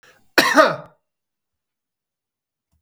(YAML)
cough_length: 2.8 s
cough_amplitude: 32768
cough_signal_mean_std_ratio: 0.27
survey_phase: beta (2021-08-13 to 2022-03-07)
age: 45-64
gender: Male
wearing_mask: 'No'
symptom_none: true
smoker_status: Ex-smoker
respiratory_condition_asthma: true
respiratory_condition_other: false
recruitment_source: REACT
submission_delay: 3 days
covid_test_result: Negative
covid_test_method: RT-qPCR
influenza_a_test_result: Negative
influenza_b_test_result: Negative